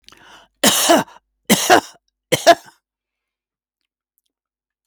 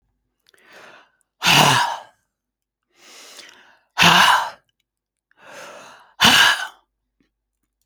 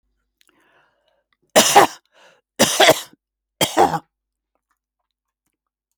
{"cough_length": "4.9 s", "cough_amplitude": 32768, "cough_signal_mean_std_ratio": 0.31, "exhalation_length": "7.9 s", "exhalation_amplitude": 32767, "exhalation_signal_mean_std_ratio": 0.36, "three_cough_length": "6.0 s", "three_cough_amplitude": 32768, "three_cough_signal_mean_std_ratio": 0.29, "survey_phase": "beta (2021-08-13 to 2022-03-07)", "age": "65+", "gender": "Female", "wearing_mask": "No", "symptom_none": true, "smoker_status": "Never smoked", "respiratory_condition_asthma": true, "respiratory_condition_other": false, "recruitment_source": "REACT", "submission_delay": "2 days", "covid_test_result": "Negative", "covid_test_method": "RT-qPCR"}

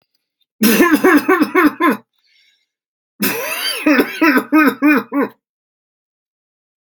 {"cough_length": "7.0 s", "cough_amplitude": 32768, "cough_signal_mean_std_ratio": 0.53, "survey_phase": "alpha (2021-03-01 to 2021-08-12)", "age": "65+", "gender": "Male", "wearing_mask": "No", "symptom_none": true, "smoker_status": "Never smoked", "respiratory_condition_asthma": false, "respiratory_condition_other": false, "recruitment_source": "REACT", "submission_delay": "1 day", "covid_test_result": "Negative", "covid_test_method": "RT-qPCR"}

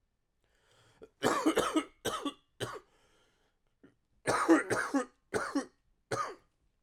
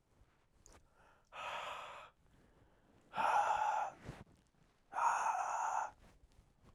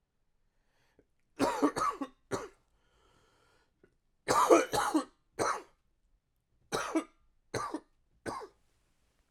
{"cough_length": "6.8 s", "cough_amplitude": 8594, "cough_signal_mean_std_ratio": 0.42, "exhalation_length": "6.7 s", "exhalation_amplitude": 2356, "exhalation_signal_mean_std_ratio": 0.51, "three_cough_length": "9.3 s", "three_cough_amplitude": 12411, "three_cough_signal_mean_std_ratio": 0.35, "survey_phase": "alpha (2021-03-01 to 2021-08-12)", "age": "18-44", "gender": "Male", "wearing_mask": "No", "symptom_cough_any": true, "symptom_new_continuous_cough": true, "symptom_fatigue": true, "symptom_fever_high_temperature": true, "symptom_headache": true, "smoker_status": "Never smoked", "respiratory_condition_asthma": true, "respiratory_condition_other": false, "recruitment_source": "Test and Trace", "submission_delay": "1 day", "covid_test_result": "Positive", "covid_test_method": "LFT"}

